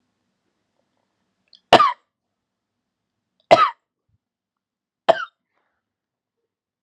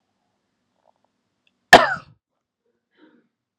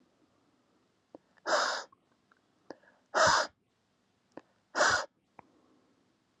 {"three_cough_length": "6.8 s", "three_cough_amplitude": 32768, "three_cough_signal_mean_std_ratio": 0.19, "cough_length": "3.6 s", "cough_amplitude": 32768, "cough_signal_mean_std_ratio": 0.15, "exhalation_length": "6.4 s", "exhalation_amplitude": 7704, "exhalation_signal_mean_std_ratio": 0.31, "survey_phase": "alpha (2021-03-01 to 2021-08-12)", "age": "18-44", "gender": "Male", "wearing_mask": "No", "symptom_cough_any": true, "symptom_new_continuous_cough": true, "symptom_abdominal_pain": true, "symptom_fatigue": true, "symptom_onset": "3 days", "smoker_status": "Current smoker (1 to 10 cigarettes per day)", "respiratory_condition_asthma": false, "respiratory_condition_other": false, "recruitment_source": "Test and Trace", "submission_delay": "2 days", "covid_test_result": "Positive", "covid_test_method": "ePCR"}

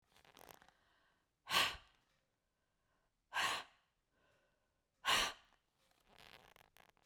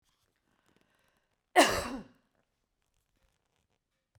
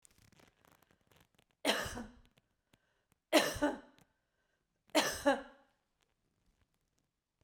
{"exhalation_length": "7.1 s", "exhalation_amplitude": 3169, "exhalation_signal_mean_std_ratio": 0.27, "cough_length": "4.2 s", "cough_amplitude": 12769, "cough_signal_mean_std_ratio": 0.2, "three_cough_length": "7.4 s", "three_cough_amplitude": 7368, "three_cough_signal_mean_std_ratio": 0.28, "survey_phase": "beta (2021-08-13 to 2022-03-07)", "age": "45-64", "gender": "Female", "wearing_mask": "No", "symptom_none": true, "smoker_status": "Never smoked", "respiratory_condition_asthma": false, "respiratory_condition_other": false, "recruitment_source": "REACT", "submission_delay": "2 days", "covid_test_result": "Negative", "covid_test_method": "RT-qPCR", "influenza_a_test_result": "Unknown/Void", "influenza_b_test_result": "Unknown/Void"}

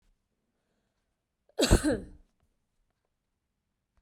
{"cough_length": "4.0 s", "cough_amplitude": 12632, "cough_signal_mean_std_ratio": 0.22, "survey_phase": "beta (2021-08-13 to 2022-03-07)", "age": "18-44", "gender": "Female", "wearing_mask": "No", "symptom_runny_or_blocked_nose": true, "smoker_status": "Never smoked", "respiratory_condition_asthma": false, "respiratory_condition_other": false, "recruitment_source": "Test and Trace", "submission_delay": "2 days", "covid_test_result": "Positive", "covid_test_method": "RT-qPCR", "covid_ct_value": 30.8, "covid_ct_gene": "ORF1ab gene", "covid_ct_mean": 31.7, "covid_viral_load": "39 copies/ml", "covid_viral_load_category": "Minimal viral load (< 10K copies/ml)"}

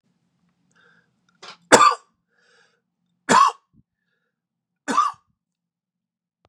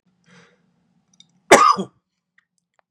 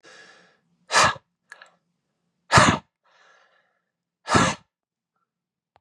{"three_cough_length": "6.5 s", "three_cough_amplitude": 32768, "three_cough_signal_mean_std_ratio": 0.24, "cough_length": "2.9 s", "cough_amplitude": 32768, "cough_signal_mean_std_ratio": 0.24, "exhalation_length": "5.8 s", "exhalation_amplitude": 29349, "exhalation_signal_mean_std_ratio": 0.27, "survey_phase": "beta (2021-08-13 to 2022-03-07)", "age": "45-64", "gender": "Male", "wearing_mask": "No", "symptom_cough_any": true, "symptom_runny_or_blocked_nose": true, "symptom_sore_throat": true, "symptom_fatigue": true, "symptom_headache": true, "symptom_onset": "3 days", "smoker_status": "Ex-smoker", "respiratory_condition_asthma": false, "respiratory_condition_other": false, "recruitment_source": "Test and Trace", "submission_delay": "2 days", "covid_test_result": "Positive", "covid_test_method": "RT-qPCR", "covid_ct_value": 28.4, "covid_ct_gene": "N gene"}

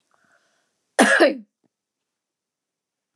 {"cough_length": "3.2 s", "cough_amplitude": 28676, "cough_signal_mean_std_ratio": 0.27, "survey_phase": "beta (2021-08-13 to 2022-03-07)", "age": "65+", "gender": "Female", "wearing_mask": "No", "symptom_none": true, "smoker_status": "Never smoked", "respiratory_condition_asthma": false, "respiratory_condition_other": false, "recruitment_source": "REACT", "submission_delay": "1 day", "covid_test_result": "Negative", "covid_test_method": "RT-qPCR"}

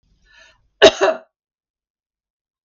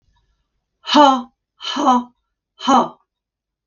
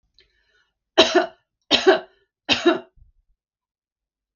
{"cough_length": "2.6 s", "cough_amplitude": 32768, "cough_signal_mean_std_ratio": 0.22, "exhalation_length": "3.7 s", "exhalation_amplitude": 32768, "exhalation_signal_mean_std_ratio": 0.39, "three_cough_length": "4.4 s", "three_cough_amplitude": 32768, "three_cough_signal_mean_std_ratio": 0.3, "survey_phase": "beta (2021-08-13 to 2022-03-07)", "age": "45-64", "gender": "Female", "wearing_mask": "No", "symptom_none": true, "smoker_status": "Never smoked", "respiratory_condition_asthma": false, "respiratory_condition_other": false, "recruitment_source": "REACT", "submission_delay": "1 day", "covid_test_result": "Negative", "covid_test_method": "RT-qPCR", "influenza_a_test_result": "Unknown/Void", "influenza_b_test_result": "Unknown/Void"}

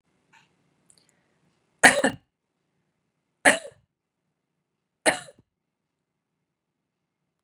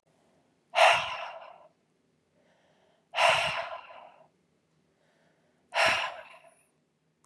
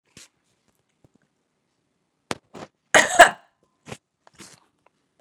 {"three_cough_length": "7.4 s", "three_cough_amplitude": 31981, "three_cough_signal_mean_std_ratio": 0.17, "exhalation_length": "7.3 s", "exhalation_amplitude": 12212, "exhalation_signal_mean_std_ratio": 0.34, "cough_length": "5.2 s", "cough_amplitude": 32768, "cough_signal_mean_std_ratio": 0.17, "survey_phase": "beta (2021-08-13 to 2022-03-07)", "age": "18-44", "gender": "Female", "wearing_mask": "No", "symptom_cough_any": true, "symptom_runny_or_blocked_nose": true, "symptom_sore_throat": true, "symptom_fatigue": true, "symptom_headache": true, "smoker_status": "Never smoked", "respiratory_condition_asthma": false, "respiratory_condition_other": false, "recruitment_source": "Test and Trace", "submission_delay": "5 days", "covid_test_method": "RT-qPCR", "covid_ct_value": 30.7, "covid_ct_gene": "N gene", "covid_ct_mean": 30.8, "covid_viral_load": "77 copies/ml", "covid_viral_load_category": "Minimal viral load (< 10K copies/ml)"}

